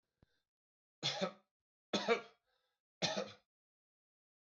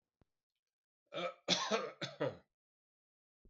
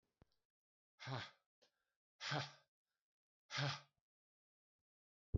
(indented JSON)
{
  "three_cough_length": "4.5 s",
  "three_cough_amplitude": 3054,
  "three_cough_signal_mean_std_ratio": 0.31,
  "cough_length": "3.5 s",
  "cough_amplitude": 4245,
  "cough_signal_mean_std_ratio": 0.37,
  "exhalation_length": "5.4 s",
  "exhalation_amplitude": 1386,
  "exhalation_signal_mean_std_ratio": 0.29,
  "survey_phase": "alpha (2021-03-01 to 2021-08-12)",
  "age": "65+",
  "gender": "Male",
  "wearing_mask": "No",
  "symptom_none": true,
  "smoker_status": "Ex-smoker",
  "respiratory_condition_asthma": false,
  "respiratory_condition_other": false,
  "recruitment_source": "REACT",
  "submission_delay": "1 day",
  "covid_test_result": "Negative",
  "covid_test_method": "RT-qPCR"
}